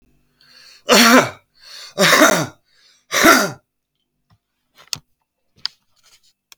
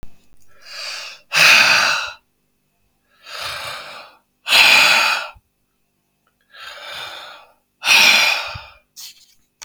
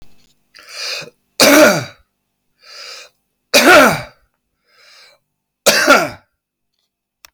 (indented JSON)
{
  "three_cough_length": "6.6 s",
  "three_cough_amplitude": 32768,
  "three_cough_signal_mean_std_ratio": 0.35,
  "exhalation_length": "9.6 s",
  "exhalation_amplitude": 32768,
  "exhalation_signal_mean_std_ratio": 0.44,
  "cough_length": "7.3 s",
  "cough_amplitude": 32768,
  "cough_signal_mean_std_ratio": 0.37,
  "survey_phase": "beta (2021-08-13 to 2022-03-07)",
  "age": "45-64",
  "gender": "Male",
  "wearing_mask": "No",
  "symptom_none": true,
  "smoker_status": "Current smoker (11 or more cigarettes per day)",
  "respiratory_condition_asthma": false,
  "respiratory_condition_other": true,
  "recruitment_source": "REACT",
  "submission_delay": "1 day",
  "covid_test_result": "Negative",
  "covid_test_method": "RT-qPCR",
  "influenza_a_test_result": "Negative",
  "influenza_b_test_result": "Negative"
}